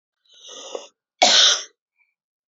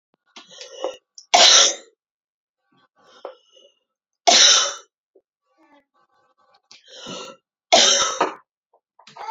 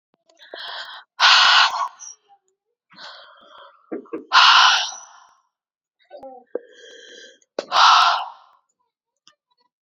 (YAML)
cough_length: 2.5 s
cough_amplitude: 30824
cough_signal_mean_std_ratio: 0.34
three_cough_length: 9.3 s
three_cough_amplitude: 32768
three_cough_signal_mean_std_ratio: 0.32
exhalation_length: 9.8 s
exhalation_amplitude: 30928
exhalation_signal_mean_std_ratio: 0.37
survey_phase: beta (2021-08-13 to 2022-03-07)
age: 18-44
gender: Female
wearing_mask: 'No'
symptom_cough_any: true
symptom_headache: true
smoker_status: Ex-smoker
respiratory_condition_asthma: false
respiratory_condition_other: false
recruitment_source: Test and Trace
submission_delay: 2 days
covid_test_result: Positive
covid_test_method: RT-qPCR
covid_ct_value: 30.9
covid_ct_gene: ORF1ab gene
covid_ct_mean: 31.5
covid_viral_load: 45 copies/ml
covid_viral_load_category: Minimal viral load (< 10K copies/ml)